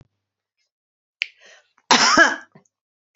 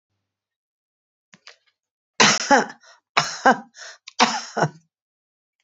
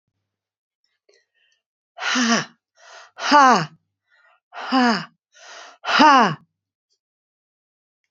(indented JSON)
{
  "cough_length": "3.2 s",
  "cough_amplitude": 28718,
  "cough_signal_mean_std_ratio": 0.29,
  "three_cough_length": "5.6 s",
  "three_cough_amplitude": 30061,
  "three_cough_signal_mean_std_ratio": 0.3,
  "exhalation_length": "8.1 s",
  "exhalation_amplitude": 29444,
  "exhalation_signal_mean_std_ratio": 0.33,
  "survey_phase": "beta (2021-08-13 to 2022-03-07)",
  "age": "65+",
  "gender": "Female",
  "wearing_mask": "No",
  "symptom_none": true,
  "smoker_status": "Never smoked",
  "respiratory_condition_asthma": false,
  "respiratory_condition_other": false,
  "recruitment_source": "REACT",
  "submission_delay": "1 day",
  "covid_test_result": "Negative",
  "covid_test_method": "RT-qPCR",
  "influenza_a_test_result": "Negative",
  "influenza_b_test_result": "Negative"
}